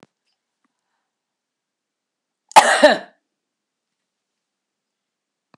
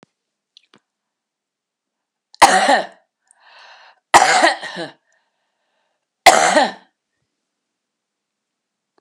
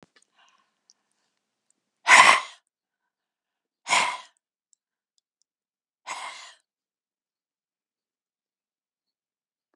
{"cough_length": "5.6 s", "cough_amplitude": 32768, "cough_signal_mean_std_ratio": 0.19, "three_cough_length": "9.0 s", "three_cough_amplitude": 32768, "three_cough_signal_mean_std_ratio": 0.29, "exhalation_length": "9.8 s", "exhalation_amplitude": 32768, "exhalation_signal_mean_std_ratio": 0.18, "survey_phase": "alpha (2021-03-01 to 2021-08-12)", "age": "65+", "gender": "Female", "wearing_mask": "No", "symptom_none": true, "smoker_status": "Never smoked", "respiratory_condition_asthma": false, "respiratory_condition_other": false, "recruitment_source": "REACT", "submission_delay": "2 days", "covid_test_result": "Negative", "covid_test_method": "RT-qPCR"}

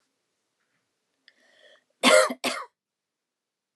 {"cough_length": "3.8 s", "cough_amplitude": 19303, "cough_signal_mean_std_ratio": 0.24, "survey_phase": "alpha (2021-03-01 to 2021-08-12)", "age": "45-64", "gender": "Female", "wearing_mask": "No", "symptom_headache": true, "symptom_onset": "12 days", "smoker_status": "Ex-smoker", "respiratory_condition_asthma": true, "respiratory_condition_other": false, "recruitment_source": "REACT", "submission_delay": "2 days", "covid_test_result": "Negative", "covid_test_method": "RT-qPCR"}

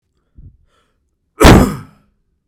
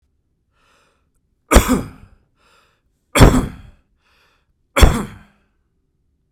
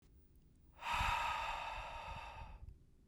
{"cough_length": "2.5 s", "cough_amplitude": 32768, "cough_signal_mean_std_ratio": 0.3, "three_cough_length": "6.3 s", "three_cough_amplitude": 32768, "three_cough_signal_mean_std_ratio": 0.27, "exhalation_length": "3.1 s", "exhalation_amplitude": 1719, "exhalation_signal_mean_std_ratio": 0.68, "survey_phase": "beta (2021-08-13 to 2022-03-07)", "age": "18-44", "gender": "Male", "wearing_mask": "No", "symptom_none": true, "smoker_status": "Never smoked", "respiratory_condition_asthma": false, "respiratory_condition_other": false, "recruitment_source": "REACT", "submission_delay": "1 day", "covid_test_result": "Negative", "covid_test_method": "RT-qPCR"}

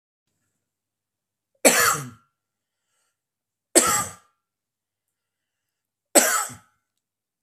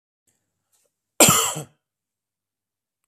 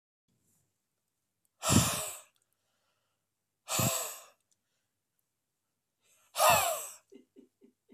{"three_cough_length": "7.4 s", "three_cough_amplitude": 32767, "three_cough_signal_mean_std_ratio": 0.27, "cough_length": "3.1 s", "cough_amplitude": 32767, "cough_signal_mean_std_ratio": 0.24, "exhalation_length": "7.9 s", "exhalation_amplitude": 9499, "exhalation_signal_mean_std_ratio": 0.31, "survey_phase": "beta (2021-08-13 to 2022-03-07)", "age": "45-64", "gender": "Male", "wearing_mask": "No", "symptom_none": true, "smoker_status": "Never smoked", "respiratory_condition_asthma": false, "respiratory_condition_other": false, "recruitment_source": "REACT", "submission_delay": "1 day", "covid_test_result": "Negative", "covid_test_method": "RT-qPCR", "influenza_a_test_result": "Negative", "influenza_b_test_result": "Negative"}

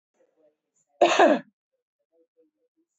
{"cough_length": "3.0 s", "cough_amplitude": 18666, "cough_signal_mean_std_ratio": 0.27, "survey_phase": "beta (2021-08-13 to 2022-03-07)", "age": "45-64", "gender": "Female", "wearing_mask": "No", "symptom_none": true, "smoker_status": "Current smoker (e-cigarettes or vapes only)", "respiratory_condition_asthma": false, "respiratory_condition_other": false, "recruitment_source": "REACT", "submission_delay": "2 days", "covid_test_result": "Negative", "covid_test_method": "RT-qPCR"}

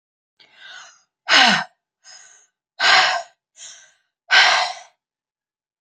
{"exhalation_length": "5.8 s", "exhalation_amplitude": 32768, "exhalation_signal_mean_std_ratio": 0.37, "survey_phase": "beta (2021-08-13 to 2022-03-07)", "age": "18-44", "gender": "Female", "wearing_mask": "No", "symptom_change_to_sense_of_smell_or_taste": true, "smoker_status": "Ex-smoker", "respiratory_condition_asthma": false, "respiratory_condition_other": false, "recruitment_source": "REACT", "submission_delay": "2 days", "covid_test_result": "Negative", "covid_test_method": "RT-qPCR"}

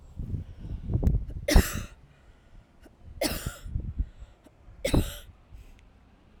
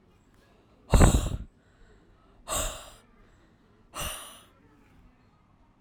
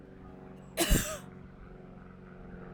{"three_cough_length": "6.4 s", "three_cough_amplitude": 16763, "three_cough_signal_mean_std_ratio": 0.42, "exhalation_length": "5.8 s", "exhalation_amplitude": 16063, "exhalation_signal_mean_std_ratio": 0.28, "cough_length": "2.7 s", "cough_amplitude": 7547, "cough_signal_mean_std_ratio": 0.44, "survey_phase": "alpha (2021-03-01 to 2021-08-12)", "age": "45-64", "gender": "Female", "wearing_mask": "No", "symptom_none": true, "smoker_status": "Never smoked", "respiratory_condition_asthma": false, "respiratory_condition_other": false, "recruitment_source": "REACT", "submission_delay": "2 days", "covid_test_result": "Negative", "covid_test_method": "RT-qPCR"}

